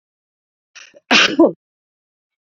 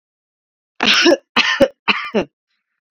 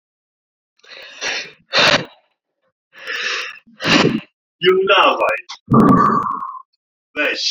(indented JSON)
{
  "cough_length": "2.5 s",
  "cough_amplitude": 32768,
  "cough_signal_mean_std_ratio": 0.3,
  "three_cough_length": "2.9 s",
  "three_cough_amplitude": 30037,
  "three_cough_signal_mean_std_ratio": 0.44,
  "exhalation_length": "7.5 s",
  "exhalation_amplitude": 32768,
  "exhalation_signal_mean_std_ratio": 0.53,
  "survey_phase": "beta (2021-08-13 to 2022-03-07)",
  "age": "18-44",
  "gender": "Female",
  "wearing_mask": "No",
  "symptom_none": true,
  "smoker_status": "Ex-smoker",
  "respiratory_condition_asthma": false,
  "respiratory_condition_other": false,
  "recruitment_source": "Test and Trace",
  "submission_delay": "1 day",
  "covid_test_result": "Positive",
  "covid_test_method": "RT-qPCR",
  "covid_ct_value": 27.2,
  "covid_ct_gene": "ORF1ab gene",
  "covid_ct_mean": 27.8,
  "covid_viral_load": "770 copies/ml",
  "covid_viral_load_category": "Minimal viral load (< 10K copies/ml)"
}